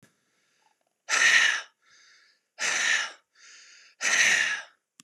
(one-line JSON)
{"exhalation_length": "5.0 s", "exhalation_amplitude": 13434, "exhalation_signal_mean_std_ratio": 0.46, "survey_phase": "beta (2021-08-13 to 2022-03-07)", "age": "45-64", "gender": "Male", "wearing_mask": "No", "symptom_none": true, "smoker_status": "Never smoked", "respiratory_condition_asthma": false, "respiratory_condition_other": false, "recruitment_source": "REACT", "submission_delay": "6 days", "covid_test_result": "Negative", "covid_test_method": "RT-qPCR", "influenza_a_test_result": "Negative", "influenza_b_test_result": "Negative"}